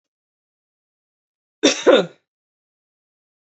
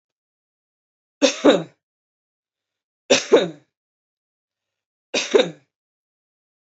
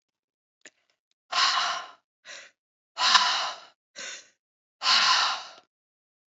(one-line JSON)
{"cough_length": "3.5 s", "cough_amplitude": 29387, "cough_signal_mean_std_ratio": 0.23, "three_cough_length": "6.7 s", "three_cough_amplitude": 27571, "three_cough_signal_mean_std_ratio": 0.26, "exhalation_length": "6.3 s", "exhalation_amplitude": 26721, "exhalation_signal_mean_std_ratio": 0.42, "survey_phase": "beta (2021-08-13 to 2022-03-07)", "age": "18-44", "gender": "Male", "wearing_mask": "No", "symptom_cough_any": true, "symptom_runny_or_blocked_nose": true, "symptom_onset": "1 day", "smoker_status": "Ex-smoker", "respiratory_condition_asthma": false, "respiratory_condition_other": false, "recruitment_source": "Test and Trace", "submission_delay": "1 day", "covid_test_result": "Negative", "covid_test_method": "RT-qPCR"}